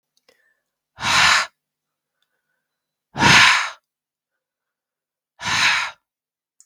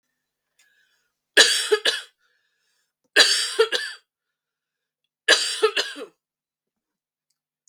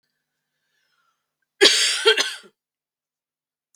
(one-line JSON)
{"exhalation_length": "6.7 s", "exhalation_amplitude": 32768, "exhalation_signal_mean_std_ratio": 0.35, "three_cough_length": "7.7 s", "three_cough_amplitude": 32768, "three_cough_signal_mean_std_ratio": 0.33, "cough_length": "3.8 s", "cough_amplitude": 32768, "cough_signal_mean_std_ratio": 0.3, "survey_phase": "beta (2021-08-13 to 2022-03-07)", "age": "18-44", "gender": "Female", "wearing_mask": "No", "symptom_cough_any": true, "symptom_runny_or_blocked_nose": true, "symptom_fatigue": true, "symptom_headache": true, "smoker_status": "Never smoked", "respiratory_condition_asthma": false, "respiratory_condition_other": false, "recruitment_source": "Test and Trace", "submission_delay": "2 days", "covid_test_result": "Positive", "covid_test_method": "RT-qPCR", "covid_ct_value": 23.6, "covid_ct_gene": "ORF1ab gene", "covid_ct_mean": 24.0, "covid_viral_load": "13000 copies/ml", "covid_viral_load_category": "Low viral load (10K-1M copies/ml)"}